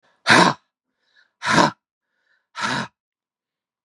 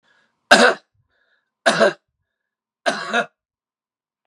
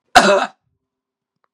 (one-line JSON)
{"exhalation_length": "3.8 s", "exhalation_amplitude": 32767, "exhalation_signal_mean_std_ratio": 0.32, "three_cough_length": "4.3 s", "three_cough_amplitude": 32768, "three_cough_signal_mean_std_ratio": 0.31, "cough_length": "1.5 s", "cough_amplitude": 32768, "cough_signal_mean_std_ratio": 0.34, "survey_phase": "beta (2021-08-13 to 2022-03-07)", "age": "45-64", "gender": "Male", "wearing_mask": "No", "symptom_fatigue": true, "symptom_other": true, "smoker_status": "Never smoked", "respiratory_condition_asthma": false, "respiratory_condition_other": false, "recruitment_source": "Test and Trace", "submission_delay": "1 day", "covid_test_result": "Positive", "covid_test_method": "RT-qPCR", "covid_ct_value": 27.0, "covid_ct_gene": "N gene"}